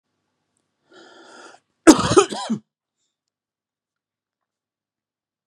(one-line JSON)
{"cough_length": "5.5 s", "cough_amplitude": 32768, "cough_signal_mean_std_ratio": 0.2, "survey_phase": "beta (2021-08-13 to 2022-03-07)", "age": "45-64", "gender": "Male", "wearing_mask": "No", "symptom_none": true, "smoker_status": "Never smoked", "respiratory_condition_asthma": false, "respiratory_condition_other": false, "recruitment_source": "REACT", "submission_delay": "1 day", "covid_test_result": "Negative", "covid_test_method": "RT-qPCR"}